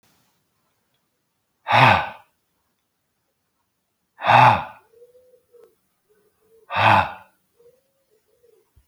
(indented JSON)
{
  "exhalation_length": "8.9 s",
  "exhalation_amplitude": 28463,
  "exhalation_signal_mean_std_ratio": 0.28,
  "survey_phase": "alpha (2021-03-01 to 2021-08-12)",
  "age": "65+",
  "gender": "Male",
  "wearing_mask": "No",
  "symptom_none": true,
  "smoker_status": "Never smoked",
  "respiratory_condition_asthma": false,
  "respiratory_condition_other": false,
  "recruitment_source": "REACT",
  "submission_delay": "3 days",
  "covid_test_result": "Negative",
  "covid_test_method": "RT-qPCR"
}